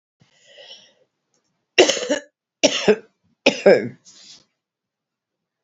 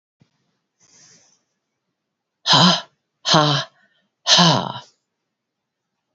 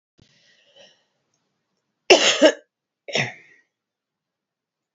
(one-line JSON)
{"three_cough_length": "5.6 s", "three_cough_amplitude": 32767, "three_cough_signal_mean_std_ratio": 0.29, "exhalation_length": "6.1 s", "exhalation_amplitude": 30337, "exhalation_signal_mean_std_ratio": 0.34, "cough_length": "4.9 s", "cough_amplitude": 32768, "cough_signal_mean_std_ratio": 0.24, "survey_phase": "beta (2021-08-13 to 2022-03-07)", "age": "45-64", "gender": "Female", "wearing_mask": "No", "symptom_cough_any": true, "symptom_new_continuous_cough": true, "symptom_runny_or_blocked_nose": true, "symptom_shortness_of_breath": true, "symptom_sore_throat": true, "symptom_fatigue": true, "symptom_headache": true, "symptom_change_to_sense_of_smell_or_taste": true, "symptom_onset": "3 days", "smoker_status": "Never smoked", "respiratory_condition_asthma": false, "respiratory_condition_other": false, "recruitment_source": "Test and Trace", "submission_delay": "2 days", "covid_test_result": "Positive", "covid_test_method": "RT-qPCR", "covid_ct_value": 15.3, "covid_ct_gene": "ORF1ab gene"}